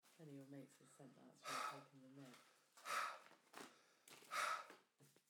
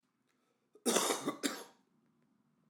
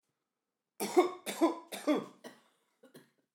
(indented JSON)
{
  "exhalation_length": "5.3 s",
  "exhalation_amplitude": 784,
  "exhalation_signal_mean_std_ratio": 0.51,
  "cough_length": "2.7 s",
  "cough_amplitude": 5424,
  "cough_signal_mean_std_ratio": 0.37,
  "three_cough_length": "3.3 s",
  "three_cough_amplitude": 7790,
  "three_cough_signal_mean_std_ratio": 0.35,
  "survey_phase": "beta (2021-08-13 to 2022-03-07)",
  "age": "45-64",
  "gender": "Male",
  "wearing_mask": "No",
  "symptom_cough_any": true,
  "symptom_runny_or_blocked_nose": true,
  "symptom_change_to_sense_of_smell_or_taste": true,
  "symptom_loss_of_taste": true,
  "symptom_onset": "7 days",
  "smoker_status": "Ex-smoker",
  "respiratory_condition_asthma": false,
  "respiratory_condition_other": false,
  "recruitment_source": "Test and Trace",
  "submission_delay": "3 days",
  "covid_test_result": "Positive",
  "covid_test_method": "RT-qPCR",
  "covid_ct_value": 14.5,
  "covid_ct_gene": "N gene",
  "covid_ct_mean": 15.0,
  "covid_viral_load": "12000000 copies/ml",
  "covid_viral_load_category": "High viral load (>1M copies/ml)"
}